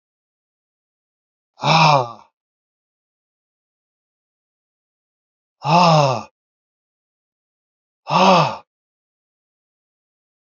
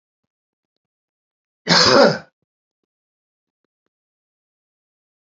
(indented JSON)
{
  "exhalation_length": "10.6 s",
  "exhalation_amplitude": 31597,
  "exhalation_signal_mean_std_ratio": 0.29,
  "cough_length": "5.3 s",
  "cough_amplitude": 32767,
  "cough_signal_mean_std_ratio": 0.24,
  "survey_phase": "alpha (2021-03-01 to 2021-08-12)",
  "age": "65+",
  "gender": "Male",
  "wearing_mask": "No",
  "symptom_none": true,
  "smoker_status": "Ex-smoker",
  "respiratory_condition_asthma": false,
  "respiratory_condition_other": false,
  "recruitment_source": "Test and Trace",
  "submission_delay": "2 days",
  "covid_test_result": "Positive",
  "covid_test_method": "RT-qPCR",
  "covid_ct_value": 27.9,
  "covid_ct_gene": "ORF1ab gene",
  "covid_ct_mean": 28.4,
  "covid_viral_load": "480 copies/ml",
  "covid_viral_load_category": "Minimal viral load (< 10K copies/ml)"
}